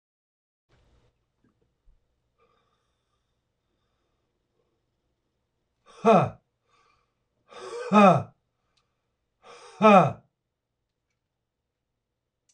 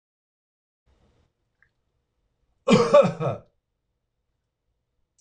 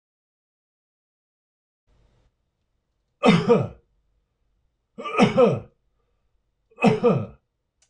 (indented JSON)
{
  "exhalation_length": "12.5 s",
  "exhalation_amplitude": 21273,
  "exhalation_signal_mean_std_ratio": 0.22,
  "cough_length": "5.2 s",
  "cough_amplitude": 21549,
  "cough_signal_mean_std_ratio": 0.24,
  "three_cough_length": "7.9 s",
  "three_cough_amplitude": 24394,
  "three_cough_signal_mean_std_ratio": 0.32,
  "survey_phase": "beta (2021-08-13 to 2022-03-07)",
  "age": "45-64",
  "gender": "Male",
  "wearing_mask": "No",
  "symptom_none": true,
  "smoker_status": "Never smoked",
  "respiratory_condition_asthma": false,
  "respiratory_condition_other": false,
  "recruitment_source": "REACT",
  "submission_delay": "1 day",
  "covid_test_result": "Negative",
  "covid_test_method": "RT-qPCR"
}